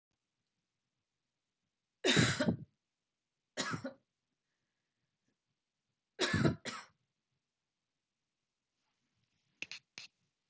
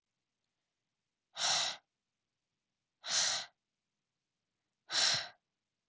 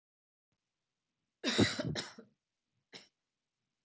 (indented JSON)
{
  "three_cough_length": "10.5 s",
  "three_cough_amplitude": 5209,
  "three_cough_signal_mean_std_ratio": 0.26,
  "exhalation_length": "5.9 s",
  "exhalation_amplitude": 3869,
  "exhalation_signal_mean_std_ratio": 0.34,
  "cough_length": "3.8 s",
  "cough_amplitude": 5823,
  "cough_signal_mean_std_ratio": 0.28,
  "survey_phase": "alpha (2021-03-01 to 2021-08-12)",
  "age": "18-44",
  "gender": "Female",
  "wearing_mask": "No",
  "symptom_none": true,
  "smoker_status": "Prefer not to say",
  "respiratory_condition_asthma": false,
  "respiratory_condition_other": false,
  "recruitment_source": "REACT",
  "submission_delay": "1 day",
  "covid_test_result": "Negative",
  "covid_test_method": "RT-qPCR"
}